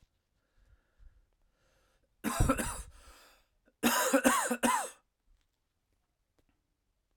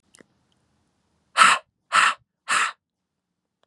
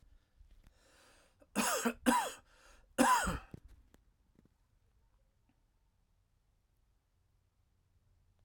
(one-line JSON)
{"cough_length": "7.2 s", "cough_amplitude": 11612, "cough_signal_mean_std_ratio": 0.36, "exhalation_length": "3.7 s", "exhalation_amplitude": 28057, "exhalation_signal_mean_std_ratio": 0.31, "three_cough_length": "8.4 s", "three_cough_amplitude": 6666, "three_cough_signal_mean_std_ratio": 0.29, "survey_phase": "alpha (2021-03-01 to 2021-08-12)", "age": "18-44", "gender": "Male", "wearing_mask": "No", "symptom_cough_any": true, "symptom_shortness_of_breath": true, "smoker_status": "Never smoked", "respiratory_condition_asthma": false, "respiratory_condition_other": false, "recruitment_source": "Test and Trace", "submission_delay": "2 days", "covid_test_result": "Positive", "covid_test_method": "RT-qPCR", "covid_ct_value": 30.9, "covid_ct_gene": "ORF1ab gene", "covid_ct_mean": 32.5, "covid_viral_load": "22 copies/ml", "covid_viral_load_category": "Minimal viral load (< 10K copies/ml)"}